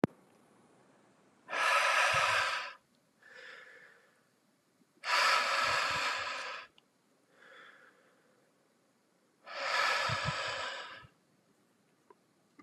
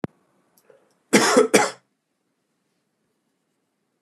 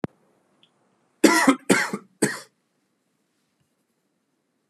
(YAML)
exhalation_length: 12.6 s
exhalation_amplitude: 8940
exhalation_signal_mean_std_ratio: 0.48
cough_length: 4.0 s
cough_amplitude: 29887
cough_signal_mean_std_ratio: 0.28
three_cough_length: 4.7 s
three_cough_amplitude: 28846
three_cough_signal_mean_std_ratio: 0.28
survey_phase: beta (2021-08-13 to 2022-03-07)
age: 18-44
gender: Male
wearing_mask: 'No'
symptom_runny_or_blocked_nose: true
symptom_sore_throat: true
symptom_diarrhoea: true
symptom_fatigue: true
symptom_fever_high_temperature: true
symptom_headache: true
symptom_onset: 4 days
smoker_status: Never smoked
respiratory_condition_asthma: false
respiratory_condition_other: false
recruitment_source: Test and Trace
submission_delay: 3 days
covid_test_result: Positive
covid_test_method: RT-qPCR
covid_ct_value: 25.3
covid_ct_gene: ORF1ab gene
covid_ct_mean: 25.4
covid_viral_load: 4700 copies/ml
covid_viral_load_category: Minimal viral load (< 10K copies/ml)